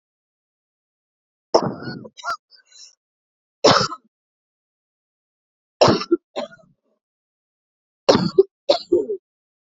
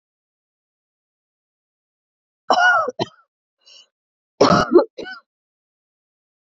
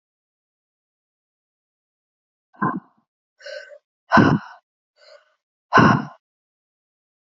{"three_cough_length": "9.7 s", "three_cough_amplitude": 32767, "three_cough_signal_mean_std_ratio": 0.28, "cough_length": "6.6 s", "cough_amplitude": 28155, "cough_signal_mean_std_ratio": 0.28, "exhalation_length": "7.3 s", "exhalation_amplitude": 31117, "exhalation_signal_mean_std_ratio": 0.25, "survey_phase": "beta (2021-08-13 to 2022-03-07)", "age": "18-44", "gender": "Female", "wearing_mask": "No", "symptom_sore_throat": true, "symptom_fatigue": true, "symptom_fever_high_temperature": true, "symptom_headache": true, "symptom_change_to_sense_of_smell_or_taste": true, "smoker_status": "Current smoker (e-cigarettes or vapes only)", "respiratory_condition_asthma": false, "respiratory_condition_other": false, "recruitment_source": "Test and Trace", "submission_delay": "2 days", "covid_test_result": "Positive", "covid_test_method": "RT-qPCR", "covid_ct_value": 17.8, "covid_ct_gene": "N gene", "covid_ct_mean": 17.9, "covid_viral_load": "1300000 copies/ml", "covid_viral_load_category": "High viral load (>1M copies/ml)"}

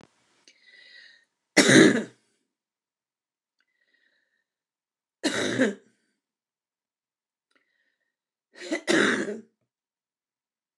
{"three_cough_length": "10.8 s", "three_cough_amplitude": 22618, "three_cough_signal_mean_std_ratio": 0.26, "survey_phase": "alpha (2021-03-01 to 2021-08-12)", "age": "65+", "gender": "Female", "wearing_mask": "No", "symptom_shortness_of_breath": true, "symptom_onset": "12 days", "smoker_status": "Ex-smoker", "respiratory_condition_asthma": false, "respiratory_condition_other": true, "recruitment_source": "REACT", "submission_delay": "1 day", "covid_test_result": "Negative", "covid_test_method": "RT-qPCR"}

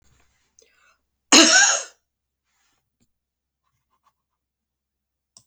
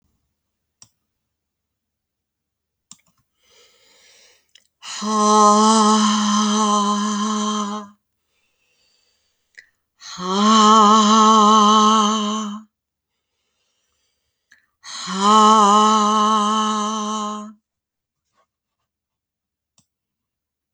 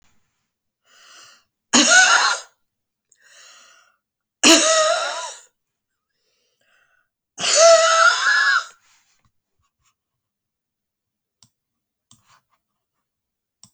{"cough_length": "5.5 s", "cough_amplitude": 32768, "cough_signal_mean_std_ratio": 0.23, "exhalation_length": "20.7 s", "exhalation_amplitude": 28208, "exhalation_signal_mean_std_ratio": 0.5, "three_cough_length": "13.7 s", "three_cough_amplitude": 31883, "three_cough_signal_mean_std_ratio": 0.35, "survey_phase": "beta (2021-08-13 to 2022-03-07)", "age": "65+", "gender": "Female", "wearing_mask": "No", "symptom_cough_any": true, "symptom_runny_or_blocked_nose": true, "smoker_status": "Never smoked", "respiratory_condition_asthma": false, "respiratory_condition_other": false, "recruitment_source": "REACT", "submission_delay": "2 days", "covid_test_result": "Negative", "covid_test_method": "RT-qPCR"}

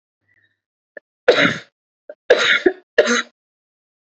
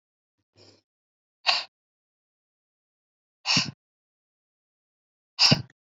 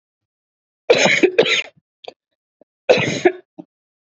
{"three_cough_length": "4.0 s", "three_cough_amplitude": 27430, "three_cough_signal_mean_std_ratio": 0.36, "exhalation_length": "6.0 s", "exhalation_amplitude": 17500, "exhalation_signal_mean_std_ratio": 0.22, "cough_length": "4.0 s", "cough_amplitude": 32767, "cough_signal_mean_std_ratio": 0.38, "survey_phase": "beta (2021-08-13 to 2022-03-07)", "age": "18-44", "gender": "Female", "wearing_mask": "No", "symptom_cough_any": true, "symptom_new_continuous_cough": true, "symptom_runny_or_blocked_nose": true, "symptom_sore_throat": true, "symptom_onset": "12 days", "smoker_status": "Never smoked", "respiratory_condition_asthma": false, "respiratory_condition_other": false, "recruitment_source": "REACT", "submission_delay": "6 days", "covid_test_result": "Negative", "covid_test_method": "RT-qPCR", "influenza_a_test_result": "Unknown/Void", "influenza_b_test_result": "Unknown/Void"}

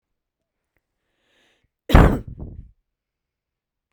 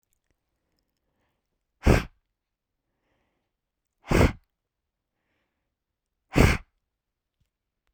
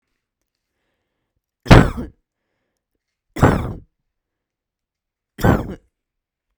{"cough_length": "3.9 s", "cough_amplitude": 32768, "cough_signal_mean_std_ratio": 0.21, "exhalation_length": "7.9 s", "exhalation_amplitude": 20541, "exhalation_signal_mean_std_ratio": 0.21, "three_cough_length": "6.6 s", "three_cough_amplitude": 32768, "three_cough_signal_mean_std_ratio": 0.23, "survey_phase": "beta (2021-08-13 to 2022-03-07)", "age": "18-44", "gender": "Female", "wearing_mask": "No", "symptom_runny_or_blocked_nose": true, "symptom_onset": "4 days", "smoker_status": "Ex-smoker", "respiratory_condition_asthma": false, "respiratory_condition_other": false, "recruitment_source": "REACT", "submission_delay": "1 day", "covid_test_result": "Negative", "covid_test_method": "RT-qPCR"}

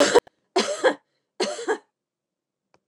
{"three_cough_length": "2.9 s", "three_cough_amplitude": 24632, "three_cough_signal_mean_std_ratio": 0.38, "survey_phase": "beta (2021-08-13 to 2022-03-07)", "age": "45-64", "gender": "Female", "wearing_mask": "No", "symptom_none": true, "smoker_status": "Never smoked", "respiratory_condition_asthma": false, "respiratory_condition_other": false, "recruitment_source": "Test and Trace", "submission_delay": "0 days", "covid_test_result": "Negative", "covid_test_method": "LFT"}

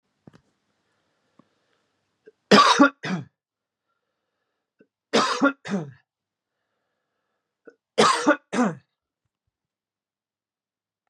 {"three_cough_length": "11.1 s", "three_cough_amplitude": 28472, "three_cough_signal_mean_std_ratio": 0.27, "survey_phase": "beta (2021-08-13 to 2022-03-07)", "age": "18-44", "gender": "Male", "wearing_mask": "No", "symptom_none": true, "smoker_status": "Never smoked", "respiratory_condition_asthma": false, "respiratory_condition_other": false, "recruitment_source": "REACT", "submission_delay": "1 day", "covid_test_result": "Negative", "covid_test_method": "RT-qPCR", "influenza_a_test_result": "Negative", "influenza_b_test_result": "Negative"}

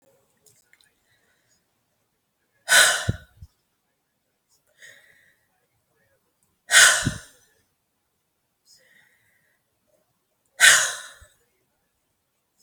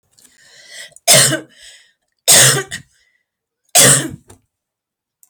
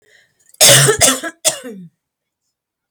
{"exhalation_length": "12.6 s", "exhalation_amplitude": 32768, "exhalation_signal_mean_std_ratio": 0.22, "three_cough_length": "5.3 s", "three_cough_amplitude": 32768, "three_cough_signal_mean_std_ratio": 0.36, "cough_length": "2.9 s", "cough_amplitude": 32768, "cough_signal_mean_std_ratio": 0.4, "survey_phase": "alpha (2021-03-01 to 2021-08-12)", "age": "45-64", "gender": "Female", "wearing_mask": "No", "symptom_none": true, "symptom_onset": "6 days", "smoker_status": "Never smoked", "respiratory_condition_asthma": false, "respiratory_condition_other": false, "recruitment_source": "REACT", "submission_delay": "1 day", "covid_test_result": "Negative", "covid_test_method": "RT-qPCR"}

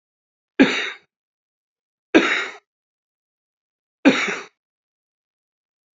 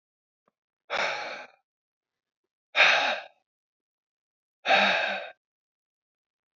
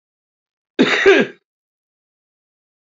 {"three_cough_length": "6.0 s", "three_cough_amplitude": 30519, "three_cough_signal_mean_std_ratio": 0.27, "exhalation_length": "6.6 s", "exhalation_amplitude": 16631, "exhalation_signal_mean_std_ratio": 0.34, "cough_length": "2.9 s", "cough_amplitude": 28448, "cough_signal_mean_std_ratio": 0.31, "survey_phase": "beta (2021-08-13 to 2022-03-07)", "age": "45-64", "gender": "Male", "wearing_mask": "No", "symptom_cough_any": true, "symptom_runny_or_blocked_nose": true, "symptom_shortness_of_breath": true, "symptom_fatigue": true, "symptom_headache": true, "symptom_onset": "4 days", "smoker_status": "Current smoker (11 or more cigarettes per day)", "respiratory_condition_asthma": false, "respiratory_condition_other": false, "recruitment_source": "Test and Trace", "submission_delay": "1 day", "covid_test_result": "Positive", "covid_test_method": "RT-qPCR", "covid_ct_value": 21.8, "covid_ct_gene": "N gene"}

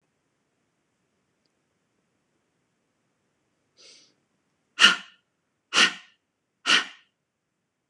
{"exhalation_length": "7.9 s", "exhalation_amplitude": 26021, "exhalation_signal_mean_std_ratio": 0.19, "survey_phase": "beta (2021-08-13 to 2022-03-07)", "age": "18-44", "gender": "Female", "wearing_mask": "No", "symptom_none": true, "smoker_status": "Ex-smoker", "respiratory_condition_asthma": false, "respiratory_condition_other": false, "recruitment_source": "REACT", "submission_delay": "1 day", "covid_test_result": "Negative", "covid_test_method": "RT-qPCR"}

